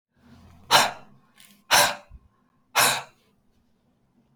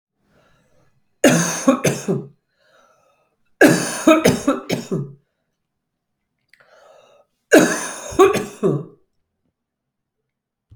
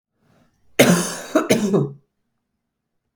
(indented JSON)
{
  "exhalation_length": "4.4 s",
  "exhalation_amplitude": 23834,
  "exhalation_signal_mean_std_ratio": 0.32,
  "three_cough_length": "10.8 s",
  "three_cough_amplitude": 32768,
  "three_cough_signal_mean_std_ratio": 0.36,
  "cough_length": "3.2 s",
  "cough_amplitude": 32766,
  "cough_signal_mean_std_ratio": 0.41,
  "survey_phase": "beta (2021-08-13 to 2022-03-07)",
  "age": "45-64",
  "gender": "Female",
  "wearing_mask": "No",
  "symptom_cough_any": true,
  "symptom_runny_or_blocked_nose": true,
  "symptom_fatigue": true,
  "symptom_onset": "2 days",
  "smoker_status": "Ex-smoker",
  "respiratory_condition_asthma": false,
  "respiratory_condition_other": false,
  "recruitment_source": "Test and Trace",
  "submission_delay": "1 day",
  "covid_test_result": "Negative",
  "covid_test_method": "RT-qPCR"
}